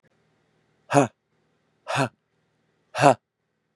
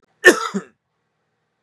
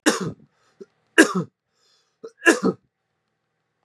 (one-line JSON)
{"exhalation_length": "3.8 s", "exhalation_amplitude": 28305, "exhalation_signal_mean_std_ratio": 0.24, "cough_length": "1.6 s", "cough_amplitude": 32768, "cough_signal_mean_std_ratio": 0.25, "three_cough_length": "3.8 s", "three_cough_amplitude": 32767, "three_cough_signal_mean_std_ratio": 0.28, "survey_phase": "beta (2021-08-13 to 2022-03-07)", "age": "45-64", "gender": "Male", "wearing_mask": "No", "symptom_new_continuous_cough": true, "symptom_runny_or_blocked_nose": true, "symptom_onset": "4 days", "smoker_status": "Never smoked", "respiratory_condition_asthma": false, "respiratory_condition_other": false, "recruitment_source": "Test and Trace", "submission_delay": "1 day", "covid_test_result": "Positive", "covid_test_method": "RT-qPCR", "covid_ct_value": 19.5, "covid_ct_gene": "ORF1ab gene"}